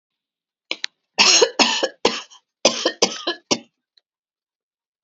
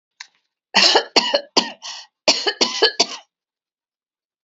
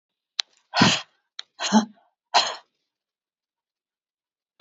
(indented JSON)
{
  "three_cough_length": "5.0 s",
  "three_cough_amplitude": 32767,
  "three_cough_signal_mean_std_ratio": 0.36,
  "cough_length": "4.4 s",
  "cough_amplitude": 31465,
  "cough_signal_mean_std_ratio": 0.39,
  "exhalation_length": "4.6 s",
  "exhalation_amplitude": 26880,
  "exhalation_signal_mean_std_ratio": 0.28,
  "survey_phase": "alpha (2021-03-01 to 2021-08-12)",
  "age": "45-64",
  "gender": "Female",
  "wearing_mask": "No",
  "symptom_none": true,
  "symptom_onset": "5 days",
  "smoker_status": "Never smoked",
  "respiratory_condition_asthma": false,
  "respiratory_condition_other": false,
  "recruitment_source": "REACT",
  "submission_delay": "3 days",
  "covid_test_result": "Negative",
  "covid_test_method": "RT-qPCR"
}